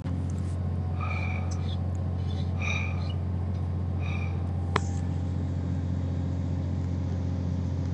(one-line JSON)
{"exhalation_length": "7.9 s", "exhalation_amplitude": 17657, "exhalation_signal_mean_std_ratio": 1.54, "survey_phase": "beta (2021-08-13 to 2022-03-07)", "age": "18-44", "gender": "Male", "wearing_mask": "No", "symptom_none": true, "smoker_status": "Ex-smoker", "respiratory_condition_asthma": false, "respiratory_condition_other": false, "recruitment_source": "REACT", "submission_delay": "3 days", "covid_test_result": "Negative", "covid_test_method": "RT-qPCR", "influenza_a_test_result": "Negative", "influenza_b_test_result": "Negative"}